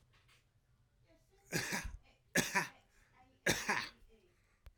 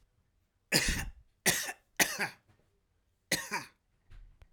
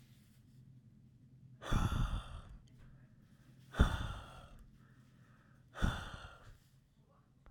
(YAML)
three_cough_length: 4.8 s
three_cough_amplitude: 5485
three_cough_signal_mean_std_ratio: 0.37
cough_length: 4.5 s
cough_amplitude: 12206
cough_signal_mean_std_ratio: 0.37
exhalation_length: 7.5 s
exhalation_amplitude: 6635
exhalation_signal_mean_std_ratio: 0.37
survey_phase: alpha (2021-03-01 to 2021-08-12)
age: 45-64
gender: Male
wearing_mask: 'No'
symptom_none: true
smoker_status: Ex-smoker
respiratory_condition_asthma: false
respiratory_condition_other: false
recruitment_source: REACT
submission_delay: 1 day
covid_test_result: Negative
covid_test_method: RT-qPCR